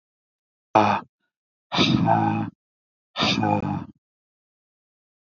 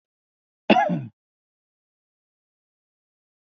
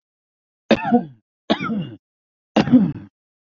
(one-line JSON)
{"exhalation_length": "5.4 s", "exhalation_amplitude": 24470, "exhalation_signal_mean_std_ratio": 0.44, "cough_length": "3.5 s", "cough_amplitude": 25096, "cough_signal_mean_std_ratio": 0.22, "three_cough_length": "3.5 s", "three_cough_amplitude": 26542, "three_cough_signal_mean_std_ratio": 0.38, "survey_phase": "beta (2021-08-13 to 2022-03-07)", "age": "18-44", "gender": "Male", "wearing_mask": "No", "symptom_none": true, "smoker_status": "Never smoked", "respiratory_condition_asthma": false, "respiratory_condition_other": false, "recruitment_source": "REACT", "submission_delay": "1 day", "covid_test_result": "Negative", "covid_test_method": "RT-qPCR", "influenza_a_test_result": "Negative", "influenza_b_test_result": "Negative"}